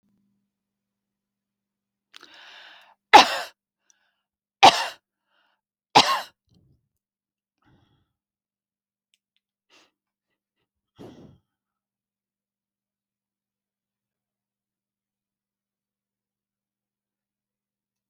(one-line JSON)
{"three_cough_length": "18.1 s", "three_cough_amplitude": 30667, "three_cough_signal_mean_std_ratio": 0.13, "survey_phase": "beta (2021-08-13 to 2022-03-07)", "age": "65+", "gender": "Female", "wearing_mask": "No", "symptom_none": true, "smoker_status": "Never smoked", "respiratory_condition_asthma": false, "respiratory_condition_other": false, "recruitment_source": "REACT", "submission_delay": "1 day", "covid_test_result": "Negative", "covid_test_method": "RT-qPCR"}